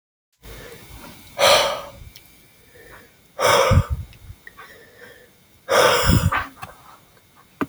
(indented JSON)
{
  "exhalation_length": "7.7 s",
  "exhalation_amplitude": 24355,
  "exhalation_signal_mean_std_ratio": 0.42,
  "survey_phase": "beta (2021-08-13 to 2022-03-07)",
  "age": "18-44",
  "gender": "Male",
  "wearing_mask": "No",
  "symptom_runny_or_blocked_nose": true,
  "symptom_fatigue": true,
  "symptom_headache": true,
  "symptom_change_to_sense_of_smell_or_taste": true,
  "smoker_status": "Never smoked",
  "respiratory_condition_asthma": false,
  "respiratory_condition_other": false,
  "recruitment_source": "Test and Trace",
  "submission_delay": "0 days",
  "covid_test_result": "Positive",
  "covid_test_method": "LFT"
}